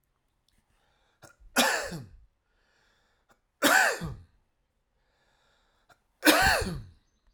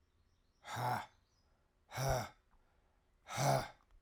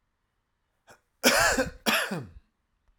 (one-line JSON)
{"three_cough_length": "7.3 s", "three_cough_amplitude": 15992, "three_cough_signal_mean_std_ratio": 0.33, "exhalation_length": "4.0 s", "exhalation_amplitude": 3533, "exhalation_signal_mean_std_ratio": 0.42, "cough_length": "3.0 s", "cough_amplitude": 16901, "cough_signal_mean_std_ratio": 0.41, "survey_phase": "alpha (2021-03-01 to 2021-08-12)", "age": "45-64", "gender": "Male", "wearing_mask": "No", "symptom_none": true, "smoker_status": "Ex-smoker", "respiratory_condition_asthma": false, "respiratory_condition_other": false, "recruitment_source": "REACT", "submission_delay": "3 days", "covid_test_result": "Negative", "covid_test_method": "RT-qPCR"}